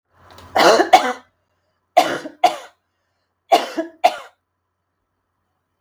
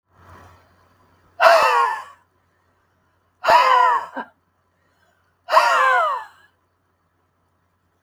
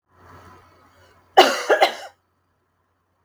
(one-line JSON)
{"three_cough_length": "5.8 s", "three_cough_amplitude": 32768, "three_cough_signal_mean_std_ratio": 0.33, "exhalation_length": "8.0 s", "exhalation_amplitude": 32766, "exhalation_signal_mean_std_ratio": 0.41, "cough_length": "3.2 s", "cough_amplitude": 32768, "cough_signal_mean_std_ratio": 0.28, "survey_phase": "beta (2021-08-13 to 2022-03-07)", "age": "45-64", "gender": "Female", "wearing_mask": "No", "symptom_none": true, "smoker_status": "Never smoked", "respiratory_condition_asthma": false, "respiratory_condition_other": false, "recruitment_source": "REACT", "submission_delay": "2 days", "covid_test_result": "Negative", "covid_test_method": "RT-qPCR"}